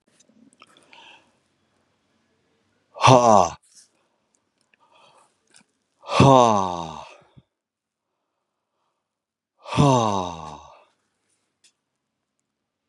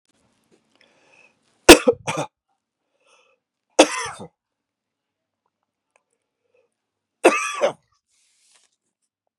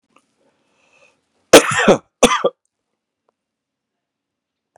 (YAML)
exhalation_length: 12.9 s
exhalation_amplitude: 32276
exhalation_signal_mean_std_ratio: 0.26
three_cough_length: 9.4 s
three_cough_amplitude: 32768
three_cough_signal_mean_std_ratio: 0.18
cough_length: 4.8 s
cough_amplitude: 32768
cough_signal_mean_std_ratio: 0.24
survey_phase: beta (2021-08-13 to 2022-03-07)
age: 45-64
gender: Male
wearing_mask: 'No'
symptom_cough_any: true
symptom_runny_or_blocked_nose: true
symptom_sore_throat: true
symptom_fatigue: true
symptom_headache: true
symptom_onset: 2 days
smoker_status: Never smoked
respiratory_condition_asthma: false
respiratory_condition_other: false
recruitment_source: Test and Trace
submission_delay: 1 day
covid_test_result: Positive
covid_test_method: RT-qPCR
covid_ct_value: 15.1
covid_ct_gene: ORF1ab gene
covid_ct_mean: 15.3
covid_viral_load: 9600000 copies/ml
covid_viral_load_category: High viral load (>1M copies/ml)